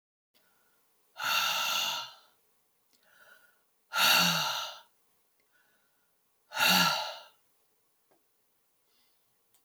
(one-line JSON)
{"exhalation_length": "9.6 s", "exhalation_amplitude": 9197, "exhalation_signal_mean_std_ratio": 0.38, "survey_phase": "alpha (2021-03-01 to 2021-08-12)", "age": "65+", "gender": "Female", "wearing_mask": "No", "symptom_none": true, "smoker_status": "Never smoked", "respiratory_condition_asthma": false, "respiratory_condition_other": false, "recruitment_source": "REACT", "submission_delay": "5 days", "covid_test_result": "Negative", "covid_test_method": "RT-qPCR"}